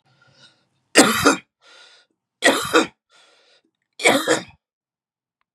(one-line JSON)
{"three_cough_length": "5.5 s", "three_cough_amplitude": 32768, "three_cough_signal_mean_std_ratio": 0.34, "survey_phase": "beta (2021-08-13 to 2022-03-07)", "age": "45-64", "gender": "Male", "wearing_mask": "No", "symptom_cough_any": true, "symptom_sore_throat": true, "symptom_headache": true, "smoker_status": "Never smoked", "respiratory_condition_asthma": false, "respiratory_condition_other": false, "recruitment_source": "REACT", "submission_delay": "2 days", "covid_test_result": "Negative", "covid_test_method": "RT-qPCR", "influenza_a_test_result": "Negative", "influenza_b_test_result": "Negative"}